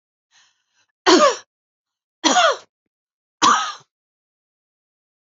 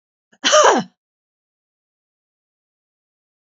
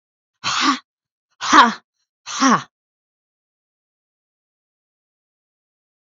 three_cough_length: 5.4 s
three_cough_amplitude: 30965
three_cough_signal_mean_std_ratio: 0.32
cough_length: 3.5 s
cough_amplitude: 31221
cough_signal_mean_std_ratio: 0.26
exhalation_length: 6.1 s
exhalation_amplitude: 28298
exhalation_signal_mean_std_ratio: 0.27
survey_phase: beta (2021-08-13 to 2022-03-07)
age: 45-64
gender: Female
wearing_mask: 'No'
symptom_none: true
smoker_status: Ex-smoker
respiratory_condition_asthma: false
respiratory_condition_other: false
recruitment_source: REACT
submission_delay: 2 days
covid_test_result: Negative
covid_test_method: RT-qPCR
influenza_a_test_result: Negative
influenza_b_test_result: Negative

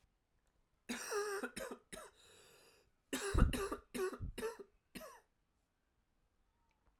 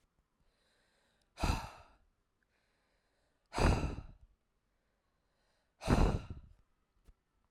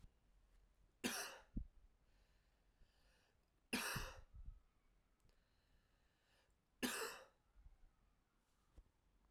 cough_length: 7.0 s
cough_amplitude: 5913
cough_signal_mean_std_ratio: 0.37
exhalation_length: 7.5 s
exhalation_amplitude: 6754
exhalation_signal_mean_std_ratio: 0.28
three_cough_length: 9.3 s
three_cough_amplitude: 1285
three_cough_signal_mean_std_ratio: 0.36
survey_phase: alpha (2021-03-01 to 2021-08-12)
age: 18-44
gender: Male
wearing_mask: 'No'
symptom_cough_any: true
symptom_new_continuous_cough: true
symptom_fatigue: true
symptom_fever_high_temperature: true
symptom_headache: true
symptom_onset: 2 days
smoker_status: Never smoked
respiratory_condition_asthma: false
respiratory_condition_other: false
recruitment_source: Test and Trace
submission_delay: 1 day
covid_test_result: Positive
covid_test_method: RT-qPCR
covid_ct_value: 28.2
covid_ct_gene: N gene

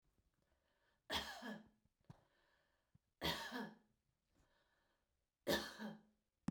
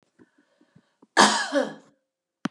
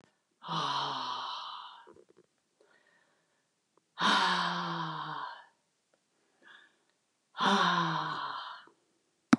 three_cough_length: 6.5 s
three_cough_amplitude: 1678
three_cough_signal_mean_std_ratio: 0.34
cough_length: 2.5 s
cough_amplitude: 27691
cough_signal_mean_std_ratio: 0.32
exhalation_length: 9.4 s
exhalation_amplitude: 12015
exhalation_signal_mean_std_ratio: 0.46
survey_phase: beta (2021-08-13 to 2022-03-07)
age: 65+
gender: Female
wearing_mask: 'No'
symptom_none: true
smoker_status: Ex-smoker
respiratory_condition_asthma: false
respiratory_condition_other: false
recruitment_source: REACT
submission_delay: 1 day
covid_test_result: Negative
covid_test_method: RT-qPCR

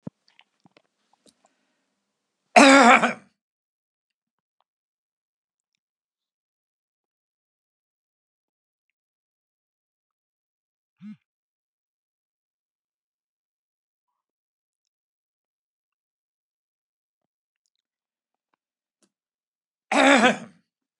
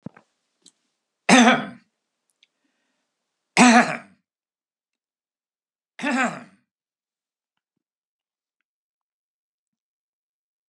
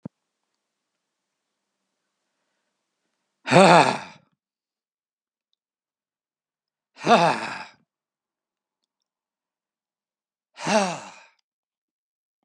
cough_length: 21.0 s
cough_amplitude: 32359
cough_signal_mean_std_ratio: 0.15
three_cough_length: 10.7 s
three_cough_amplitude: 31150
three_cough_signal_mean_std_ratio: 0.22
exhalation_length: 12.4 s
exhalation_amplitude: 30386
exhalation_signal_mean_std_ratio: 0.22
survey_phase: beta (2021-08-13 to 2022-03-07)
age: 65+
gender: Male
wearing_mask: 'No'
symptom_none: true
symptom_onset: 13 days
smoker_status: Never smoked
respiratory_condition_asthma: false
respiratory_condition_other: false
recruitment_source: REACT
submission_delay: 1 day
covid_test_result: Negative
covid_test_method: RT-qPCR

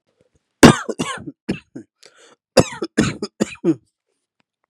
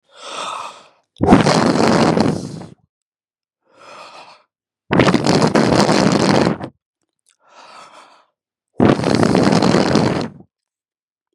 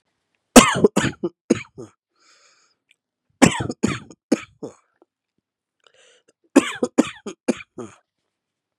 cough_length: 4.7 s
cough_amplitude: 32768
cough_signal_mean_std_ratio: 0.27
exhalation_length: 11.3 s
exhalation_amplitude: 32768
exhalation_signal_mean_std_ratio: 0.52
three_cough_length: 8.8 s
three_cough_amplitude: 32768
three_cough_signal_mean_std_ratio: 0.25
survey_phase: beta (2021-08-13 to 2022-03-07)
age: 18-44
gender: Male
wearing_mask: 'Yes'
symptom_none: true
smoker_status: Never smoked
respiratory_condition_asthma: false
respiratory_condition_other: false
recruitment_source: Test and Trace
submission_delay: 3 days
covid_test_result: Positive
covid_test_method: RT-qPCR
covid_ct_value: 14.5
covid_ct_gene: ORF1ab gene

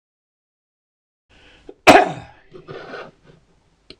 cough_length: 4.0 s
cough_amplitude: 26028
cough_signal_mean_std_ratio: 0.21
survey_phase: beta (2021-08-13 to 2022-03-07)
age: 45-64
gender: Male
wearing_mask: 'No'
symptom_cough_any: true
smoker_status: Ex-smoker
respiratory_condition_asthma: false
respiratory_condition_other: false
recruitment_source: REACT
submission_delay: 14 days
covid_test_result: Negative
covid_test_method: RT-qPCR
influenza_a_test_result: Unknown/Void
influenza_b_test_result: Unknown/Void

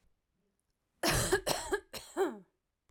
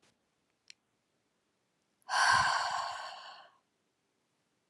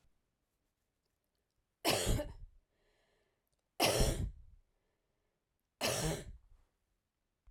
cough_length: 2.9 s
cough_amplitude: 6693
cough_signal_mean_std_ratio: 0.45
exhalation_length: 4.7 s
exhalation_amplitude: 5864
exhalation_signal_mean_std_ratio: 0.36
three_cough_length: 7.5 s
three_cough_amplitude: 4716
three_cough_signal_mean_std_ratio: 0.35
survey_phase: alpha (2021-03-01 to 2021-08-12)
age: 45-64
gender: Female
wearing_mask: 'No'
symptom_none: true
smoker_status: Never smoked
respiratory_condition_asthma: false
respiratory_condition_other: false
recruitment_source: REACT
submission_delay: 2 days
covid_test_result: Negative
covid_test_method: RT-qPCR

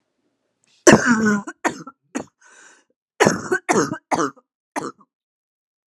cough_length: 5.9 s
cough_amplitude: 32768
cough_signal_mean_std_ratio: 0.35
survey_phase: alpha (2021-03-01 to 2021-08-12)
age: 18-44
gender: Female
wearing_mask: 'No'
symptom_cough_any: true
symptom_fatigue: true
symptom_headache: true
smoker_status: Never smoked
respiratory_condition_asthma: false
respiratory_condition_other: false
recruitment_source: Test and Trace
submission_delay: 2 days
covid_test_result: Positive
covid_test_method: RT-qPCR
covid_ct_value: 18.4
covid_ct_gene: ORF1ab gene
covid_ct_mean: 18.9
covid_viral_load: 650000 copies/ml
covid_viral_load_category: Low viral load (10K-1M copies/ml)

